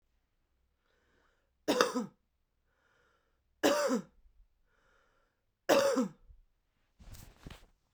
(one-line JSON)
{"three_cough_length": "7.9 s", "three_cough_amplitude": 14365, "three_cough_signal_mean_std_ratio": 0.31, "survey_phase": "beta (2021-08-13 to 2022-03-07)", "age": "18-44", "gender": "Female", "wearing_mask": "No", "symptom_cough_any": true, "symptom_runny_or_blocked_nose": true, "symptom_fatigue": true, "symptom_headache": true, "symptom_change_to_sense_of_smell_or_taste": true, "smoker_status": "Never smoked", "respiratory_condition_asthma": false, "respiratory_condition_other": false, "recruitment_source": "Test and Trace", "submission_delay": "1 day", "covid_test_result": "Positive", "covid_test_method": "LFT"}